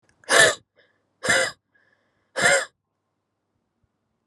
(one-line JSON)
{"exhalation_length": "4.3 s", "exhalation_amplitude": 26826, "exhalation_signal_mean_std_ratio": 0.33, "survey_phase": "alpha (2021-03-01 to 2021-08-12)", "age": "18-44", "gender": "Female", "wearing_mask": "No", "symptom_cough_any": true, "symptom_fatigue": true, "symptom_change_to_sense_of_smell_or_taste": true, "symptom_onset": "3 days", "smoker_status": "Never smoked", "respiratory_condition_asthma": false, "respiratory_condition_other": false, "recruitment_source": "Test and Trace", "submission_delay": "2 days", "covid_test_result": "Positive", "covid_test_method": "RT-qPCR", "covid_ct_value": 17.0, "covid_ct_gene": "S gene", "covid_ct_mean": 17.2, "covid_viral_load": "2300000 copies/ml", "covid_viral_load_category": "High viral load (>1M copies/ml)"}